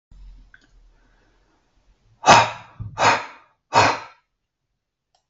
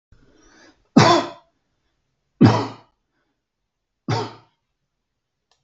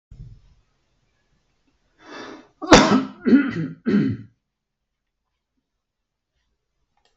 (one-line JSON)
{"exhalation_length": "5.3 s", "exhalation_amplitude": 32768, "exhalation_signal_mean_std_ratio": 0.29, "three_cough_length": "5.6 s", "three_cough_amplitude": 32768, "three_cough_signal_mean_std_ratio": 0.26, "cough_length": "7.2 s", "cough_amplitude": 32768, "cough_signal_mean_std_ratio": 0.29, "survey_phase": "beta (2021-08-13 to 2022-03-07)", "age": "45-64", "gender": "Male", "wearing_mask": "No", "symptom_none": true, "smoker_status": "Ex-smoker", "recruitment_source": "REACT", "submission_delay": "17 days", "covid_test_result": "Negative", "covid_test_method": "RT-qPCR"}